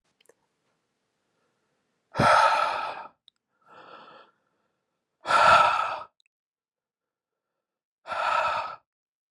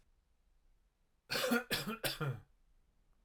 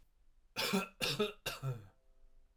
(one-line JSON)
{"exhalation_length": "9.3 s", "exhalation_amplitude": 15991, "exhalation_signal_mean_std_ratio": 0.36, "cough_length": "3.2 s", "cough_amplitude": 2762, "cough_signal_mean_std_ratio": 0.44, "three_cough_length": "2.6 s", "three_cough_amplitude": 3535, "three_cough_signal_mean_std_ratio": 0.52, "survey_phase": "alpha (2021-03-01 to 2021-08-12)", "age": "18-44", "gender": "Male", "wearing_mask": "No", "symptom_none": true, "smoker_status": "Never smoked", "respiratory_condition_asthma": false, "respiratory_condition_other": false, "recruitment_source": "REACT", "submission_delay": "1 day", "covid_test_result": "Negative", "covid_test_method": "RT-qPCR"}